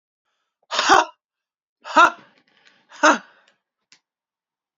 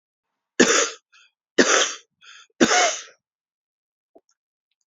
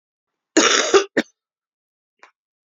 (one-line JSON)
{"exhalation_length": "4.8 s", "exhalation_amplitude": 28685, "exhalation_signal_mean_std_ratio": 0.26, "three_cough_length": "4.9 s", "three_cough_amplitude": 27154, "three_cough_signal_mean_std_ratio": 0.35, "cough_length": "2.6 s", "cough_amplitude": 31965, "cough_signal_mean_std_ratio": 0.33, "survey_phase": "beta (2021-08-13 to 2022-03-07)", "age": "45-64", "gender": "Female", "wearing_mask": "No", "symptom_cough_any": true, "symptom_runny_or_blocked_nose": true, "symptom_shortness_of_breath": true, "symptom_sore_throat": true, "symptom_fatigue": true, "symptom_headache": true, "smoker_status": "Ex-smoker", "respiratory_condition_asthma": true, "respiratory_condition_other": true, "recruitment_source": "Test and Trace", "submission_delay": "2 days", "covid_test_result": "Positive", "covid_test_method": "RT-qPCR", "covid_ct_value": 32.3, "covid_ct_gene": "ORF1ab gene"}